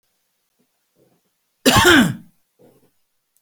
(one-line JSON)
{"cough_length": "3.4 s", "cough_amplitude": 30986, "cough_signal_mean_std_ratio": 0.3, "survey_phase": "beta (2021-08-13 to 2022-03-07)", "age": "65+", "gender": "Male", "wearing_mask": "No", "symptom_cough_any": true, "smoker_status": "Ex-smoker", "respiratory_condition_asthma": false, "respiratory_condition_other": false, "recruitment_source": "REACT", "submission_delay": "1 day", "covid_test_result": "Negative", "covid_test_method": "RT-qPCR"}